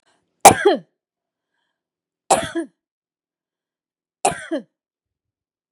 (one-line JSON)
{"three_cough_length": "5.7 s", "three_cough_amplitude": 32768, "three_cough_signal_mean_std_ratio": 0.22, "survey_phase": "beta (2021-08-13 to 2022-03-07)", "age": "45-64", "gender": "Female", "wearing_mask": "No", "symptom_none": true, "smoker_status": "Never smoked", "respiratory_condition_asthma": false, "respiratory_condition_other": false, "recruitment_source": "REACT", "submission_delay": "4 days", "covid_test_result": "Negative", "covid_test_method": "RT-qPCR", "influenza_a_test_result": "Negative", "influenza_b_test_result": "Negative"}